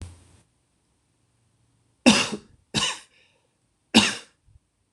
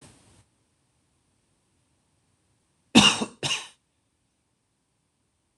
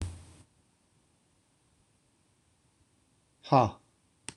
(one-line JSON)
{"three_cough_length": "4.9 s", "three_cough_amplitude": 26027, "three_cough_signal_mean_std_ratio": 0.26, "cough_length": "5.6 s", "cough_amplitude": 25862, "cough_signal_mean_std_ratio": 0.19, "exhalation_length": "4.4 s", "exhalation_amplitude": 11895, "exhalation_signal_mean_std_ratio": 0.2, "survey_phase": "alpha (2021-03-01 to 2021-08-12)", "age": "18-44", "gender": "Male", "wearing_mask": "No", "symptom_shortness_of_breath": true, "symptom_fatigue": true, "smoker_status": "Never smoked", "respiratory_condition_asthma": false, "respiratory_condition_other": false, "recruitment_source": "REACT", "submission_delay": "1 day", "covid_test_result": "Negative", "covid_test_method": "RT-qPCR"}